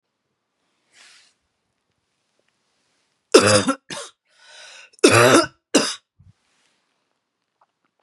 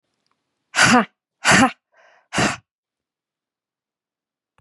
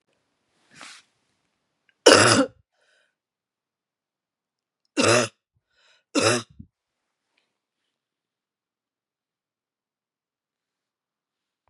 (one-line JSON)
{"three_cough_length": "8.0 s", "three_cough_amplitude": 32768, "three_cough_signal_mean_std_ratio": 0.27, "exhalation_length": "4.6 s", "exhalation_amplitude": 31502, "exhalation_signal_mean_std_ratio": 0.31, "cough_length": "11.7 s", "cough_amplitude": 32767, "cough_signal_mean_std_ratio": 0.21, "survey_phase": "beta (2021-08-13 to 2022-03-07)", "age": "45-64", "gender": "Female", "wearing_mask": "No", "symptom_cough_any": true, "symptom_fatigue": true, "symptom_headache": true, "smoker_status": "Never smoked", "respiratory_condition_asthma": false, "respiratory_condition_other": false, "recruitment_source": "Test and Trace", "submission_delay": "2 days", "covid_test_result": "Positive", "covid_test_method": "LFT"}